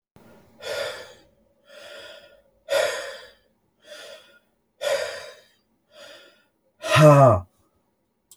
{
  "exhalation_length": "8.4 s",
  "exhalation_amplitude": 26176,
  "exhalation_signal_mean_std_ratio": 0.3,
  "survey_phase": "beta (2021-08-13 to 2022-03-07)",
  "age": "65+",
  "gender": "Male",
  "wearing_mask": "No",
  "symptom_none": true,
  "smoker_status": "Never smoked",
  "respiratory_condition_asthma": false,
  "respiratory_condition_other": false,
  "recruitment_source": "REACT",
  "submission_delay": "1 day",
  "covid_test_result": "Negative",
  "covid_test_method": "RT-qPCR"
}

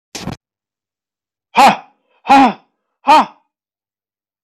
{
  "exhalation_length": "4.4 s",
  "exhalation_amplitude": 29368,
  "exhalation_signal_mean_std_ratio": 0.33,
  "survey_phase": "alpha (2021-03-01 to 2021-08-12)",
  "age": "45-64",
  "gender": "Male",
  "wearing_mask": "No",
  "symptom_shortness_of_breath": true,
  "symptom_fatigue": true,
  "symptom_headache": true,
  "smoker_status": "Never smoked",
  "respiratory_condition_asthma": true,
  "respiratory_condition_other": false,
  "recruitment_source": "REACT",
  "submission_delay": "2 days",
  "covid_test_result": "Negative",
  "covid_test_method": "RT-qPCR"
}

